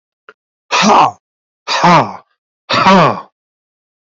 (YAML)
exhalation_length: 4.2 s
exhalation_amplitude: 32016
exhalation_signal_mean_std_ratio: 0.48
survey_phase: beta (2021-08-13 to 2022-03-07)
age: 65+
gender: Male
wearing_mask: 'No'
symptom_none: true
smoker_status: Ex-smoker
respiratory_condition_asthma: true
respiratory_condition_other: false
recruitment_source: REACT
submission_delay: 1 day
covid_test_result: Negative
covid_test_method: RT-qPCR